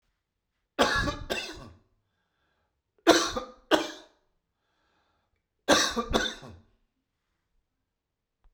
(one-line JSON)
{"three_cough_length": "8.5 s", "three_cough_amplitude": 22074, "three_cough_signal_mean_std_ratio": 0.32, "survey_phase": "beta (2021-08-13 to 2022-03-07)", "age": "65+", "gender": "Male", "wearing_mask": "No", "symptom_none": true, "smoker_status": "Ex-smoker", "respiratory_condition_asthma": false, "respiratory_condition_other": false, "recruitment_source": "REACT", "submission_delay": "2 days", "covid_test_result": "Negative", "covid_test_method": "RT-qPCR"}